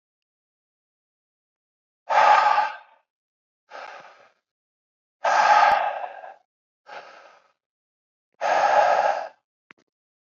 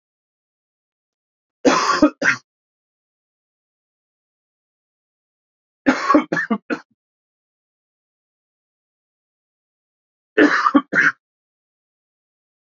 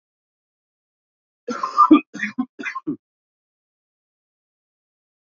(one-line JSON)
{"exhalation_length": "10.3 s", "exhalation_amplitude": 18732, "exhalation_signal_mean_std_ratio": 0.39, "three_cough_length": "12.6 s", "three_cough_amplitude": 28521, "three_cough_signal_mean_std_ratio": 0.28, "cough_length": "5.2 s", "cough_amplitude": 27434, "cough_signal_mean_std_ratio": 0.24, "survey_phase": "beta (2021-08-13 to 2022-03-07)", "age": "18-44", "gender": "Male", "wearing_mask": "No", "symptom_cough_any": true, "symptom_new_continuous_cough": true, "symptom_runny_or_blocked_nose": true, "symptom_shortness_of_breath": true, "symptom_headache": true, "symptom_change_to_sense_of_smell_or_taste": true, "symptom_loss_of_taste": true, "symptom_other": true, "symptom_onset": "4 days", "smoker_status": "Current smoker (e-cigarettes or vapes only)", "respiratory_condition_asthma": false, "respiratory_condition_other": false, "recruitment_source": "Test and Trace", "submission_delay": "1 day", "covid_test_result": "Positive", "covid_test_method": "RT-qPCR", "covid_ct_value": 17.1, "covid_ct_gene": "ORF1ab gene", "covid_ct_mean": 17.7, "covid_viral_load": "1600000 copies/ml", "covid_viral_load_category": "High viral load (>1M copies/ml)"}